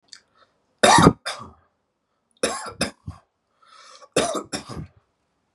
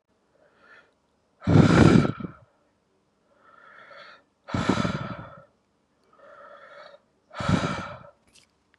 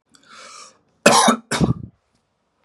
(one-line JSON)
{"three_cough_length": "5.5 s", "three_cough_amplitude": 32768, "three_cough_signal_mean_std_ratio": 0.3, "exhalation_length": "8.8 s", "exhalation_amplitude": 25121, "exhalation_signal_mean_std_ratio": 0.32, "cough_length": "2.6 s", "cough_amplitude": 32768, "cough_signal_mean_std_ratio": 0.36, "survey_phase": "beta (2021-08-13 to 2022-03-07)", "age": "18-44", "gender": "Male", "wearing_mask": "No", "symptom_none": true, "smoker_status": "Never smoked", "respiratory_condition_asthma": false, "respiratory_condition_other": false, "recruitment_source": "REACT", "submission_delay": "4 days", "covid_test_result": "Negative", "covid_test_method": "RT-qPCR", "influenza_a_test_result": "Negative", "influenza_b_test_result": "Negative"}